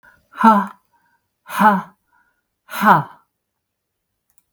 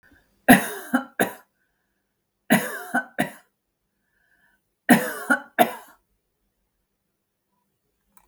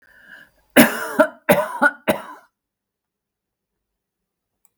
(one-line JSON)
{"exhalation_length": "4.5 s", "exhalation_amplitude": 32766, "exhalation_signal_mean_std_ratio": 0.33, "three_cough_length": "8.3 s", "three_cough_amplitude": 32766, "three_cough_signal_mean_std_ratio": 0.27, "cough_length": "4.8 s", "cough_amplitude": 32768, "cough_signal_mean_std_ratio": 0.3, "survey_phase": "beta (2021-08-13 to 2022-03-07)", "age": "65+", "gender": "Female", "wearing_mask": "No", "symptom_runny_or_blocked_nose": true, "smoker_status": "Never smoked", "respiratory_condition_asthma": false, "respiratory_condition_other": false, "recruitment_source": "Test and Trace", "submission_delay": "1 day", "covid_test_result": "Positive", "covid_test_method": "LFT"}